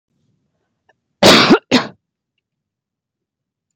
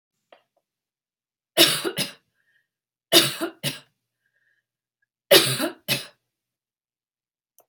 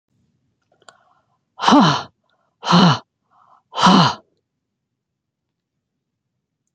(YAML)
cough_length: 3.8 s
cough_amplitude: 32768
cough_signal_mean_std_ratio: 0.29
three_cough_length: 7.7 s
three_cough_amplitude: 30192
three_cough_signal_mean_std_ratio: 0.27
exhalation_length: 6.7 s
exhalation_amplitude: 30196
exhalation_signal_mean_std_ratio: 0.32
survey_phase: beta (2021-08-13 to 2022-03-07)
age: 45-64
gender: Female
wearing_mask: 'No'
symptom_runny_or_blocked_nose: true
symptom_headache: true
smoker_status: Ex-smoker
respiratory_condition_asthma: true
respiratory_condition_other: false
recruitment_source: REACT
submission_delay: 1 day
covid_test_result: Negative
covid_test_method: RT-qPCR